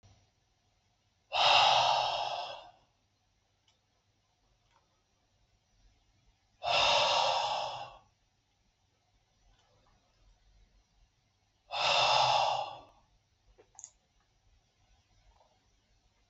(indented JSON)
{
  "exhalation_length": "16.3 s",
  "exhalation_amplitude": 8825,
  "exhalation_signal_mean_std_ratio": 0.37,
  "survey_phase": "beta (2021-08-13 to 2022-03-07)",
  "age": "18-44",
  "gender": "Male",
  "wearing_mask": "No",
  "symptom_none": true,
  "smoker_status": "Never smoked",
  "respiratory_condition_asthma": false,
  "respiratory_condition_other": false,
  "recruitment_source": "REACT",
  "submission_delay": "0 days",
  "covid_test_result": "Negative",
  "covid_test_method": "RT-qPCR",
  "influenza_a_test_result": "Negative",
  "influenza_b_test_result": "Negative"
}